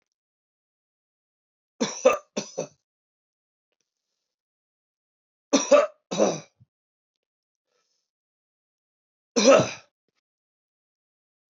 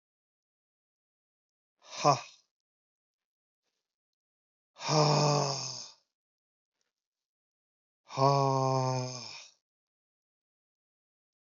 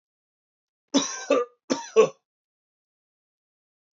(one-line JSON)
{"three_cough_length": "11.5 s", "three_cough_amplitude": 18866, "three_cough_signal_mean_std_ratio": 0.23, "exhalation_length": "11.5 s", "exhalation_amplitude": 10709, "exhalation_signal_mean_std_ratio": 0.33, "cough_length": "3.9 s", "cough_amplitude": 16991, "cough_signal_mean_std_ratio": 0.28, "survey_phase": "beta (2021-08-13 to 2022-03-07)", "age": "45-64", "gender": "Male", "wearing_mask": "No", "symptom_cough_any": true, "symptom_runny_or_blocked_nose": true, "symptom_sore_throat": true, "symptom_diarrhoea": true, "symptom_fatigue": true, "symptom_headache": true, "symptom_change_to_sense_of_smell_or_taste": true, "symptom_loss_of_taste": true, "symptom_onset": "2 days", "smoker_status": "Never smoked", "respiratory_condition_asthma": false, "respiratory_condition_other": false, "recruitment_source": "Test and Trace", "submission_delay": "1 day", "covid_test_result": "Positive", "covid_test_method": "RT-qPCR"}